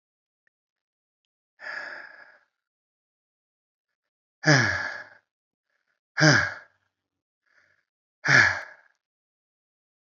{"exhalation_length": "10.1 s", "exhalation_amplitude": 20929, "exhalation_signal_mean_std_ratio": 0.26, "survey_phase": "beta (2021-08-13 to 2022-03-07)", "age": "65+", "gender": "Female", "wearing_mask": "No", "symptom_cough_any": true, "symptom_runny_or_blocked_nose": true, "smoker_status": "Current smoker (e-cigarettes or vapes only)", "respiratory_condition_asthma": false, "respiratory_condition_other": false, "recruitment_source": "Test and Trace", "submission_delay": "1 day", "covid_test_result": "Positive", "covid_test_method": "LFT"}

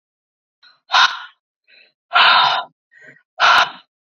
{"exhalation_length": "4.2 s", "exhalation_amplitude": 30242, "exhalation_signal_mean_std_ratio": 0.4, "survey_phase": "beta (2021-08-13 to 2022-03-07)", "age": "18-44", "gender": "Female", "wearing_mask": "No", "symptom_sore_throat": true, "symptom_headache": true, "symptom_onset": "2 days", "smoker_status": "Never smoked", "respiratory_condition_asthma": false, "respiratory_condition_other": false, "recruitment_source": "Test and Trace", "submission_delay": "1 day", "covid_test_result": "Negative", "covid_test_method": "ePCR"}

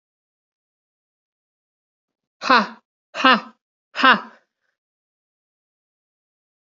{"exhalation_length": "6.7 s", "exhalation_amplitude": 29353, "exhalation_signal_mean_std_ratio": 0.22, "survey_phase": "beta (2021-08-13 to 2022-03-07)", "age": "18-44", "gender": "Female", "wearing_mask": "No", "symptom_runny_or_blocked_nose": true, "smoker_status": "Never smoked", "respiratory_condition_asthma": false, "respiratory_condition_other": false, "recruitment_source": "Test and Trace", "submission_delay": "2 days", "covid_test_result": "Positive", "covid_test_method": "ePCR"}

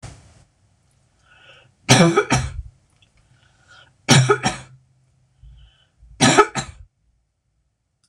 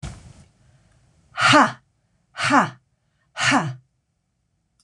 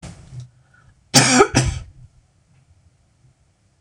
{"three_cough_length": "8.1 s", "three_cough_amplitude": 26028, "three_cough_signal_mean_std_ratio": 0.32, "exhalation_length": "4.8 s", "exhalation_amplitude": 25160, "exhalation_signal_mean_std_ratio": 0.36, "cough_length": "3.8 s", "cough_amplitude": 26028, "cough_signal_mean_std_ratio": 0.32, "survey_phase": "beta (2021-08-13 to 2022-03-07)", "age": "45-64", "gender": "Female", "wearing_mask": "No", "symptom_none": true, "smoker_status": "Never smoked", "respiratory_condition_asthma": false, "respiratory_condition_other": false, "recruitment_source": "REACT", "submission_delay": "2 days", "covid_test_result": "Negative", "covid_test_method": "RT-qPCR", "influenza_a_test_result": "Negative", "influenza_b_test_result": "Negative"}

